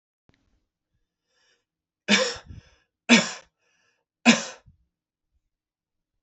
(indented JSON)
{
  "three_cough_length": "6.2 s",
  "three_cough_amplitude": 28371,
  "three_cough_signal_mean_std_ratio": 0.23,
  "survey_phase": "beta (2021-08-13 to 2022-03-07)",
  "age": "18-44",
  "gender": "Male",
  "wearing_mask": "No",
  "symptom_runny_or_blocked_nose": true,
  "symptom_loss_of_taste": true,
  "smoker_status": "Never smoked",
  "respiratory_condition_asthma": false,
  "respiratory_condition_other": false,
  "recruitment_source": "Test and Trace",
  "submission_delay": "2 days",
  "covid_test_result": "Positive",
  "covid_test_method": "RT-qPCR",
  "covid_ct_value": 18.9,
  "covid_ct_gene": "ORF1ab gene",
  "covid_ct_mean": 20.4,
  "covid_viral_load": "200000 copies/ml",
  "covid_viral_load_category": "Low viral load (10K-1M copies/ml)"
}